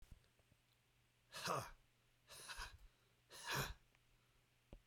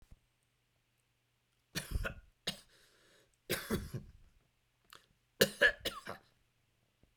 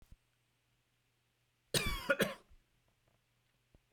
{"exhalation_length": "4.9 s", "exhalation_amplitude": 1247, "exhalation_signal_mean_std_ratio": 0.41, "three_cough_length": "7.2 s", "three_cough_amplitude": 8451, "three_cough_signal_mean_std_ratio": 0.27, "cough_length": "3.9 s", "cough_amplitude": 4785, "cough_signal_mean_std_ratio": 0.27, "survey_phase": "beta (2021-08-13 to 2022-03-07)", "age": "45-64", "gender": "Male", "wearing_mask": "No", "symptom_cough_any": true, "symptom_fatigue": true, "smoker_status": "Ex-smoker", "respiratory_condition_asthma": false, "respiratory_condition_other": false, "recruitment_source": "Test and Trace", "submission_delay": "1 day", "covid_test_result": "Positive", "covid_test_method": "RT-qPCR", "covid_ct_value": 36.0, "covid_ct_gene": "ORF1ab gene", "covid_ct_mean": 36.4, "covid_viral_load": "1.2 copies/ml", "covid_viral_load_category": "Minimal viral load (< 10K copies/ml)"}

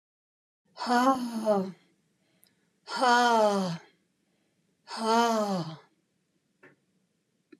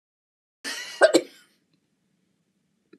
{"exhalation_length": "7.6 s", "exhalation_amplitude": 9624, "exhalation_signal_mean_std_ratio": 0.45, "cough_length": "3.0 s", "cough_amplitude": 20947, "cough_signal_mean_std_ratio": 0.22, "survey_phase": "alpha (2021-03-01 to 2021-08-12)", "age": "65+", "gender": "Female", "wearing_mask": "No", "symptom_none": true, "smoker_status": "Never smoked", "respiratory_condition_asthma": false, "respiratory_condition_other": false, "recruitment_source": "REACT", "submission_delay": "1 day", "covid_test_result": "Negative", "covid_test_method": "RT-qPCR"}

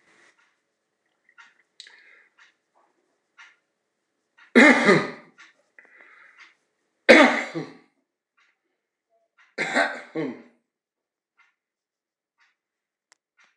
{"three_cough_length": "13.6 s", "three_cough_amplitude": 26028, "three_cough_signal_mean_std_ratio": 0.22, "survey_phase": "beta (2021-08-13 to 2022-03-07)", "age": "65+", "gender": "Male", "wearing_mask": "No", "symptom_cough_any": true, "symptom_sore_throat": true, "symptom_onset": "6 days", "smoker_status": "Never smoked", "respiratory_condition_asthma": false, "respiratory_condition_other": false, "recruitment_source": "Test and Trace", "submission_delay": "1 day", "covid_test_result": "Positive", "covid_test_method": "RT-qPCR", "covid_ct_value": 21.0, "covid_ct_gene": "ORF1ab gene", "covid_ct_mean": 21.7, "covid_viral_load": "79000 copies/ml", "covid_viral_load_category": "Low viral load (10K-1M copies/ml)"}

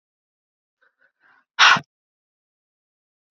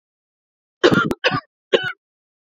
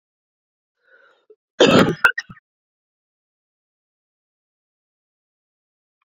{"exhalation_length": "3.3 s", "exhalation_amplitude": 29893, "exhalation_signal_mean_std_ratio": 0.19, "three_cough_length": "2.6 s", "three_cough_amplitude": 27956, "three_cough_signal_mean_std_ratio": 0.35, "cough_length": "6.1 s", "cough_amplitude": 29487, "cough_signal_mean_std_ratio": 0.2, "survey_phase": "beta (2021-08-13 to 2022-03-07)", "age": "18-44", "gender": "Female", "wearing_mask": "No", "symptom_cough_any": true, "symptom_runny_or_blocked_nose": true, "symptom_fatigue": true, "symptom_headache": true, "symptom_other": true, "symptom_onset": "2 days", "smoker_status": "Never smoked", "respiratory_condition_asthma": false, "respiratory_condition_other": false, "recruitment_source": "Test and Trace", "submission_delay": "1 day", "covid_test_result": "Positive", "covid_test_method": "RT-qPCR", "covid_ct_value": 12.6, "covid_ct_gene": "ORF1ab gene", "covid_ct_mean": 13.1, "covid_viral_load": "51000000 copies/ml", "covid_viral_load_category": "High viral load (>1M copies/ml)"}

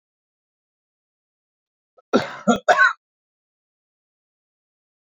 {"cough_length": "5.0 s", "cough_amplitude": 26642, "cough_signal_mean_std_ratio": 0.23, "survey_phase": "beta (2021-08-13 to 2022-03-07)", "age": "65+", "gender": "Male", "wearing_mask": "No", "symptom_none": true, "smoker_status": "Never smoked", "respiratory_condition_asthma": false, "respiratory_condition_other": false, "recruitment_source": "REACT", "submission_delay": "2 days", "covid_test_result": "Negative", "covid_test_method": "RT-qPCR"}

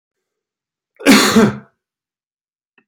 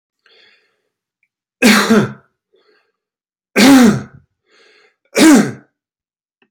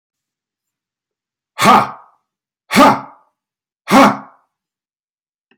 {"cough_length": "2.9 s", "cough_amplitude": 32388, "cough_signal_mean_std_ratio": 0.33, "three_cough_length": "6.5 s", "three_cough_amplitude": 32767, "three_cough_signal_mean_std_ratio": 0.37, "exhalation_length": "5.6 s", "exhalation_amplitude": 32767, "exhalation_signal_mean_std_ratio": 0.31, "survey_phase": "alpha (2021-03-01 to 2021-08-12)", "age": "45-64", "gender": "Male", "wearing_mask": "No", "symptom_none": true, "smoker_status": "Never smoked", "respiratory_condition_asthma": false, "respiratory_condition_other": false, "recruitment_source": "REACT", "submission_delay": "1 day", "covid_test_result": "Negative", "covid_test_method": "RT-qPCR"}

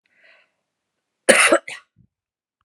{"cough_length": "2.6 s", "cough_amplitude": 32768, "cough_signal_mean_std_ratio": 0.27, "survey_phase": "beta (2021-08-13 to 2022-03-07)", "age": "65+", "gender": "Female", "wearing_mask": "No", "symptom_none": true, "smoker_status": "Never smoked", "respiratory_condition_asthma": false, "respiratory_condition_other": false, "recruitment_source": "REACT", "submission_delay": "1 day", "covid_test_result": "Negative", "covid_test_method": "RT-qPCR", "influenza_a_test_result": "Negative", "influenza_b_test_result": "Negative"}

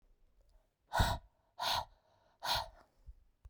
{"exhalation_length": "3.5 s", "exhalation_amplitude": 4490, "exhalation_signal_mean_std_ratio": 0.37, "survey_phase": "beta (2021-08-13 to 2022-03-07)", "age": "45-64", "gender": "Female", "wearing_mask": "No", "symptom_cough_any": true, "symptom_runny_or_blocked_nose": true, "symptom_shortness_of_breath": true, "symptom_diarrhoea": true, "symptom_fever_high_temperature": true, "symptom_change_to_sense_of_smell_or_taste": true, "symptom_loss_of_taste": true, "symptom_onset": "4 days", "smoker_status": "Ex-smoker", "respiratory_condition_asthma": false, "respiratory_condition_other": false, "recruitment_source": "Test and Trace", "submission_delay": "3 days", "covid_test_result": "Positive", "covid_test_method": "ePCR"}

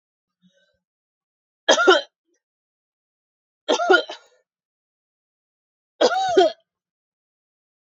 {"three_cough_length": "7.9 s", "three_cough_amplitude": 28655, "three_cough_signal_mean_std_ratio": 0.29, "survey_phase": "alpha (2021-03-01 to 2021-08-12)", "age": "18-44", "gender": "Female", "wearing_mask": "No", "symptom_cough_any": true, "symptom_new_continuous_cough": true, "symptom_fatigue": true, "symptom_change_to_sense_of_smell_or_taste": true, "symptom_loss_of_taste": true, "smoker_status": "Never smoked", "respiratory_condition_asthma": false, "respiratory_condition_other": false, "recruitment_source": "Test and Trace", "submission_delay": "2 days", "covid_test_result": "Positive", "covid_test_method": "RT-qPCR", "covid_ct_value": 18.5, "covid_ct_gene": "N gene", "covid_ct_mean": 19.1, "covid_viral_load": "530000 copies/ml", "covid_viral_load_category": "Low viral load (10K-1M copies/ml)"}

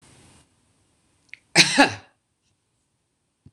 {"cough_length": "3.5 s", "cough_amplitude": 26028, "cough_signal_mean_std_ratio": 0.22, "survey_phase": "beta (2021-08-13 to 2022-03-07)", "age": "45-64", "gender": "Female", "wearing_mask": "No", "symptom_none": true, "smoker_status": "Current smoker (1 to 10 cigarettes per day)", "respiratory_condition_asthma": false, "respiratory_condition_other": false, "recruitment_source": "REACT", "submission_delay": "0 days", "covid_test_result": "Negative", "covid_test_method": "RT-qPCR"}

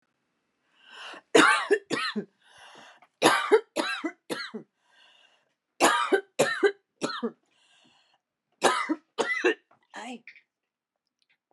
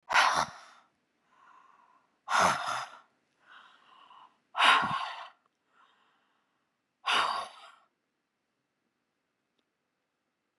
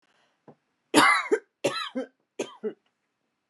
{"cough_length": "11.5 s", "cough_amplitude": 23511, "cough_signal_mean_std_ratio": 0.38, "exhalation_length": "10.6 s", "exhalation_amplitude": 12241, "exhalation_signal_mean_std_ratio": 0.32, "three_cough_length": "3.5 s", "three_cough_amplitude": 19080, "three_cough_signal_mean_std_ratio": 0.35, "survey_phase": "alpha (2021-03-01 to 2021-08-12)", "age": "45-64", "gender": "Female", "wearing_mask": "No", "symptom_abdominal_pain": true, "symptom_fatigue": true, "symptom_onset": "12 days", "smoker_status": "Ex-smoker", "respiratory_condition_asthma": true, "respiratory_condition_other": false, "recruitment_source": "REACT", "submission_delay": "1 day", "covid_test_result": "Negative", "covid_test_method": "RT-qPCR"}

